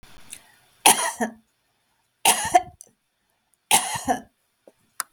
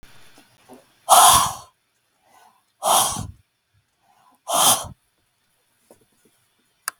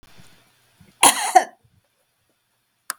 {"three_cough_length": "5.1 s", "three_cough_amplitude": 32768, "three_cough_signal_mean_std_ratio": 0.32, "exhalation_length": "7.0 s", "exhalation_amplitude": 32768, "exhalation_signal_mean_std_ratio": 0.31, "cough_length": "3.0 s", "cough_amplitude": 32768, "cough_signal_mean_std_ratio": 0.24, "survey_phase": "beta (2021-08-13 to 2022-03-07)", "age": "65+", "gender": "Female", "wearing_mask": "No", "symptom_none": true, "smoker_status": "Ex-smoker", "respiratory_condition_asthma": false, "respiratory_condition_other": false, "recruitment_source": "REACT", "submission_delay": "7 days", "covid_test_result": "Negative", "covid_test_method": "RT-qPCR", "influenza_a_test_result": "Negative", "influenza_b_test_result": "Negative"}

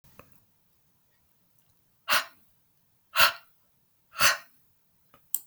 {"exhalation_length": "5.5 s", "exhalation_amplitude": 16827, "exhalation_signal_mean_std_ratio": 0.24, "survey_phase": "beta (2021-08-13 to 2022-03-07)", "age": "65+", "gender": "Female", "wearing_mask": "No", "symptom_cough_any": true, "symptom_fatigue": true, "symptom_fever_high_temperature": true, "symptom_headache": true, "symptom_change_to_sense_of_smell_or_taste": true, "symptom_loss_of_taste": true, "symptom_other": true, "symptom_onset": "9 days", "smoker_status": "Ex-smoker", "respiratory_condition_asthma": false, "respiratory_condition_other": false, "recruitment_source": "REACT", "submission_delay": "4 days", "covid_test_result": "Positive", "covid_test_method": "RT-qPCR", "covid_ct_value": 24.5, "covid_ct_gene": "E gene", "influenza_a_test_result": "Negative", "influenza_b_test_result": "Negative"}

